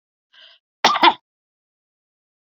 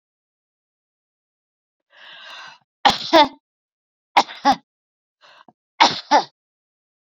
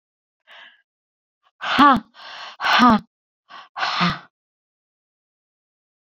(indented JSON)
{
  "cough_length": "2.5 s",
  "cough_amplitude": 30595,
  "cough_signal_mean_std_ratio": 0.24,
  "three_cough_length": "7.2 s",
  "three_cough_amplitude": 31079,
  "three_cough_signal_mean_std_ratio": 0.25,
  "exhalation_length": "6.1 s",
  "exhalation_amplitude": 27866,
  "exhalation_signal_mean_std_ratio": 0.32,
  "survey_phase": "beta (2021-08-13 to 2022-03-07)",
  "age": "65+",
  "gender": "Female",
  "wearing_mask": "No",
  "symptom_none": true,
  "smoker_status": "Ex-smoker",
  "respiratory_condition_asthma": false,
  "respiratory_condition_other": false,
  "recruitment_source": "REACT",
  "submission_delay": "4 days",
  "covid_test_result": "Negative",
  "covid_test_method": "RT-qPCR"
}